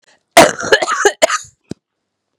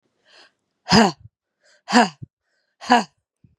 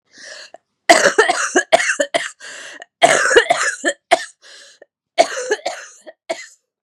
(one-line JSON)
{"cough_length": "2.4 s", "cough_amplitude": 32768, "cough_signal_mean_std_ratio": 0.4, "exhalation_length": "3.6 s", "exhalation_amplitude": 30778, "exhalation_signal_mean_std_ratio": 0.3, "three_cough_length": "6.8 s", "three_cough_amplitude": 32768, "three_cough_signal_mean_std_ratio": 0.44, "survey_phase": "beta (2021-08-13 to 2022-03-07)", "age": "18-44", "gender": "Female", "wearing_mask": "No", "symptom_cough_any": true, "symptom_runny_or_blocked_nose": true, "symptom_sore_throat": true, "symptom_diarrhoea": true, "symptom_fatigue": true, "symptom_headache": true, "smoker_status": "Never smoked", "respiratory_condition_asthma": false, "respiratory_condition_other": false, "recruitment_source": "Test and Trace", "submission_delay": "3 days", "covid_test_result": "Positive", "covid_test_method": "RT-qPCR", "covid_ct_value": 21.4, "covid_ct_gene": "S gene", "covid_ct_mean": 22.3, "covid_viral_load": "47000 copies/ml", "covid_viral_load_category": "Low viral load (10K-1M copies/ml)"}